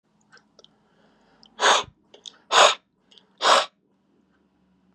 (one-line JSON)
{"exhalation_length": "4.9 s", "exhalation_amplitude": 26962, "exhalation_signal_mean_std_ratio": 0.29, "survey_phase": "beta (2021-08-13 to 2022-03-07)", "age": "18-44", "gender": "Male", "wearing_mask": "No", "symptom_none": true, "smoker_status": "Never smoked", "respiratory_condition_asthma": false, "respiratory_condition_other": false, "recruitment_source": "REACT", "submission_delay": "4 days", "covid_test_result": "Negative", "covid_test_method": "RT-qPCR", "influenza_a_test_result": "Negative", "influenza_b_test_result": "Negative"}